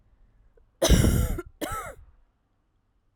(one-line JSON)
{"cough_length": "3.2 s", "cough_amplitude": 15282, "cough_signal_mean_std_ratio": 0.38, "survey_phase": "alpha (2021-03-01 to 2021-08-12)", "age": "18-44", "gender": "Female", "wearing_mask": "No", "symptom_cough_any": true, "symptom_fatigue": true, "symptom_change_to_sense_of_smell_or_taste": true, "symptom_onset": "3 days", "smoker_status": "Never smoked", "respiratory_condition_asthma": false, "respiratory_condition_other": false, "recruitment_source": "Test and Trace", "submission_delay": "2 days", "covid_test_result": "Positive", "covid_test_method": "RT-qPCR", "covid_ct_value": 17.0, "covid_ct_gene": "S gene", "covid_ct_mean": 17.2, "covid_viral_load": "2300000 copies/ml", "covid_viral_load_category": "High viral load (>1M copies/ml)"}